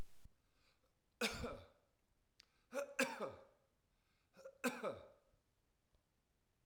{"three_cough_length": "6.7 s", "three_cough_amplitude": 2012, "three_cough_signal_mean_std_ratio": 0.36, "survey_phase": "beta (2021-08-13 to 2022-03-07)", "age": "65+", "gender": "Male", "wearing_mask": "No", "symptom_abdominal_pain": true, "symptom_onset": "12 days", "smoker_status": "Never smoked", "respiratory_condition_asthma": false, "respiratory_condition_other": false, "recruitment_source": "REACT", "submission_delay": "6 days", "covid_test_result": "Negative", "covid_test_method": "RT-qPCR", "influenza_a_test_result": "Negative", "influenza_b_test_result": "Negative"}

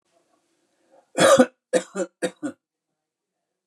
{"three_cough_length": "3.7 s", "three_cough_amplitude": 24200, "three_cough_signal_mean_std_ratio": 0.29, "survey_phase": "beta (2021-08-13 to 2022-03-07)", "age": "65+", "gender": "Male", "wearing_mask": "No", "symptom_none": true, "symptom_onset": "12 days", "smoker_status": "Ex-smoker", "respiratory_condition_asthma": false, "respiratory_condition_other": false, "recruitment_source": "REACT", "submission_delay": "2 days", "covid_test_result": "Negative", "covid_test_method": "RT-qPCR", "influenza_a_test_result": "Negative", "influenza_b_test_result": "Negative"}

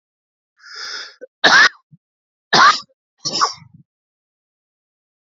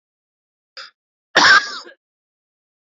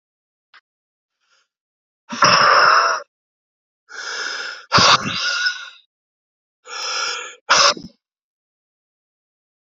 {"three_cough_length": "5.2 s", "three_cough_amplitude": 30781, "three_cough_signal_mean_std_ratio": 0.31, "cough_length": "2.8 s", "cough_amplitude": 30801, "cough_signal_mean_std_ratio": 0.27, "exhalation_length": "9.6 s", "exhalation_amplitude": 32088, "exhalation_signal_mean_std_ratio": 0.4, "survey_phase": "beta (2021-08-13 to 2022-03-07)", "age": "18-44", "gender": "Male", "wearing_mask": "No", "symptom_cough_any": true, "symptom_shortness_of_breath": true, "symptom_diarrhoea": true, "symptom_fatigue": true, "symptom_headache": true, "symptom_onset": "13 days", "smoker_status": "Never smoked", "respiratory_condition_asthma": true, "respiratory_condition_other": false, "recruitment_source": "Test and Trace", "submission_delay": "2 days", "covid_test_result": "Positive", "covid_test_method": "RT-qPCR", "covid_ct_value": 23.6, "covid_ct_gene": "ORF1ab gene", "covid_ct_mean": 23.7, "covid_viral_load": "16000 copies/ml", "covid_viral_load_category": "Low viral load (10K-1M copies/ml)"}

